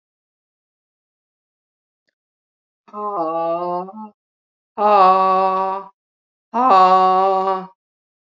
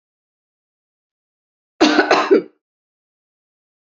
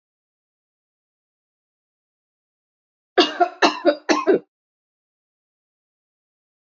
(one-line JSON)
{"exhalation_length": "8.3 s", "exhalation_amplitude": 30658, "exhalation_signal_mean_std_ratio": 0.47, "cough_length": "3.9 s", "cough_amplitude": 32767, "cough_signal_mean_std_ratio": 0.29, "three_cough_length": "6.7 s", "three_cough_amplitude": 27246, "three_cough_signal_mean_std_ratio": 0.25, "survey_phase": "alpha (2021-03-01 to 2021-08-12)", "age": "45-64", "gender": "Female", "wearing_mask": "No", "symptom_fatigue": true, "symptom_onset": "3 days", "smoker_status": "Never smoked", "respiratory_condition_asthma": false, "respiratory_condition_other": false, "recruitment_source": "Test and Trace", "submission_delay": "2 days", "covid_ct_value": 23.9, "covid_ct_gene": "ORF1ab gene"}